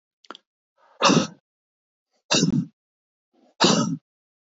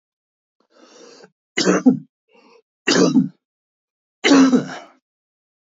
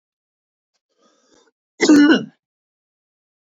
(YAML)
exhalation_length: 4.5 s
exhalation_amplitude: 22070
exhalation_signal_mean_std_ratio: 0.36
three_cough_length: 5.7 s
three_cough_amplitude: 26494
three_cough_signal_mean_std_ratio: 0.37
cough_length: 3.6 s
cough_amplitude: 29106
cough_signal_mean_std_ratio: 0.28
survey_phase: beta (2021-08-13 to 2022-03-07)
age: 18-44
gender: Male
wearing_mask: 'No'
symptom_none: true
smoker_status: Current smoker (e-cigarettes or vapes only)
respiratory_condition_asthma: false
respiratory_condition_other: false
recruitment_source: Test and Trace
submission_delay: 1 day
covid_test_result: Negative
covid_test_method: RT-qPCR